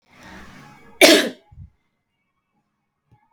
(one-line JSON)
{"cough_length": "3.3 s", "cough_amplitude": 31457, "cough_signal_mean_std_ratio": 0.24, "survey_phase": "beta (2021-08-13 to 2022-03-07)", "age": "18-44", "gender": "Female", "wearing_mask": "No", "symptom_none": true, "smoker_status": "Never smoked", "respiratory_condition_asthma": false, "respiratory_condition_other": false, "recruitment_source": "REACT", "submission_delay": "1 day", "covid_test_result": "Negative", "covid_test_method": "RT-qPCR"}